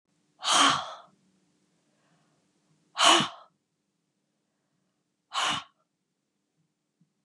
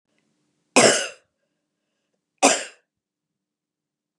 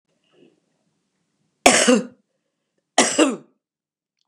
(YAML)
exhalation_length: 7.2 s
exhalation_amplitude: 20551
exhalation_signal_mean_std_ratio: 0.28
cough_length: 4.2 s
cough_amplitude: 32662
cough_signal_mean_std_ratio: 0.25
three_cough_length: 4.3 s
three_cough_amplitude: 32768
three_cough_signal_mean_std_ratio: 0.3
survey_phase: beta (2021-08-13 to 2022-03-07)
age: 65+
gender: Female
wearing_mask: 'No'
symptom_cough_any: true
smoker_status: Ex-smoker
respiratory_condition_asthma: false
respiratory_condition_other: false
recruitment_source: REACT
submission_delay: 1 day
covid_test_result: Negative
covid_test_method: RT-qPCR
influenza_a_test_result: Negative
influenza_b_test_result: Negative